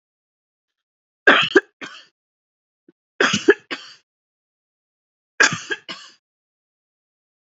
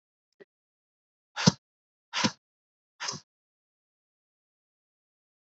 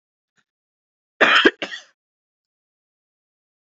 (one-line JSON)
{"three_cough_length": "7.4 s", "three_cough_amplitude": 31734, "three_cough_signal_mean_std_ratio": 0.24, "exhalation_length": "5.5 s", "exhalation_amplitude": 19587, "exhalation_signal_mean_std_ratio": 0.16, "cough_length": "3.8 s", "cough_amplitude": 28356, "cough_signal_mean_std_ratio": 0.23, "survey_phase": "beta (2021-08-13 to 2022-03-07)", "age": "45-64", "gender": "Female", "wearing_mask": "No", "symptom_new_continuous_cough": true, "symptom_runny_or_blocked_nose": true, "symptom_shortness_of_breath": true, "symptom_sore_throat": true, "symptom_fatigue": true, "symptom_fever_high_temperature": true, "symptom_headache": true, "symptom_change_to_sense_of_smell_or_taste": true, "symptom_other": true, "symptom_onset": "2 days", "smoker_status": "Never smoked", "respiratory_condition_asthma": true, "respiratory_condition_other": false, "recruitment_source": "Test and Trace", "submission_delay": "2 days", "covid_test_result": "Positive", "covid_test_method": "RT-qPCR", "covid_ct_value": 17.7, "covid_ct_gene": "N gene"}